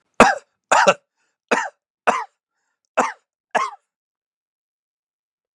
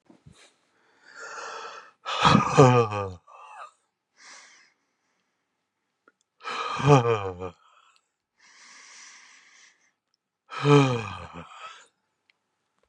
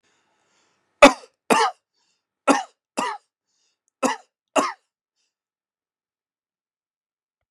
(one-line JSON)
{"cough_length": "5.5 s", "cough_amplitude": 32768, "cough_signal_mean_std_ratio": 0.28, "exhalation_length": "12.9 s", "exhalation_amplitude": 25709, "exhalation_signal_mean_std_ratio": 0.32, "three_cough_length": "7.5 s", "three_cough_amplitude": 32767, "three_cough_signal_mean_std_ratio": 0.21, "survey_phase": "beta (2021-08-13 to 2022-03-07)", "age": "65+", "gender": "Male", "wearing_mask": "No", "symptom_none": true, "smoker_status": "Never smoked", "respiratory_condition_asthma": false, "respiratory_condition_other": false, "recruitment_source": "REACT", "submission_delay": "1 day", "covid_test_result": "Negative", "covid_test_method": "RT-qPCR", "influenza_a_test_result": "Negative", "influenza_b_test_result": "Negative"}